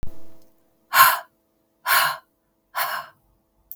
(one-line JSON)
{"exhalation_length": "3.8 s", "exhalation_amplitude": 32766, "exhalation_signal_mean_std_ratio": 0.4, "survey_phase": "beta (2021-08-13 to 2022-03-07)", "age": "45-64", "gender": "Female", "wearing_mask": "No", "symptom_none": true, "smoker_status": "Never smoked", "respiratory_condition_asthma": false, "respiratory_condition_other": false, "recruitment_source": "REACT", "submission_delay": "1 day", "covid_test_result": "Negative", "covid_test_method": "RT-qPCR", "influenza_a_test_result": "Unknown/Void", "influenza_b_test_result": "Unknown/Void"}